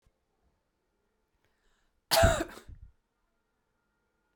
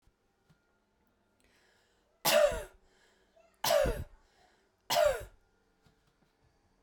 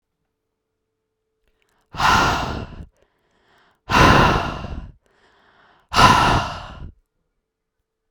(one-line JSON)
{"cough_length": "4.4 s", "cough_amplitude": 11622, "cough_signal_mean_std_ratio": 0.22, "three_cough_length": "6.8 s", "three_cough_amplitude": 6986, "three_cough_signal_mean_std_ratio": 0.32, "exhalation_length": "8.1 s", "exhalation_amplitude": 32768, "exhalation_signal_mean_std_ratio": 0.39, "survey_phase": "beta (2021-08-13 to 2022-03-07)", "age": "45-64", "gender": "Female", "wearing_mask": "No", "symptom_cough_any": true, "smoker_status": "Never smoked", "respiratory_condition_asthma": true, "respiratory_condition_other": false, "recruitment_source": "Test and Trace", "submission_delay": "0 days", "covid_test_result": "Negative", "covid_test_method": "LFT"}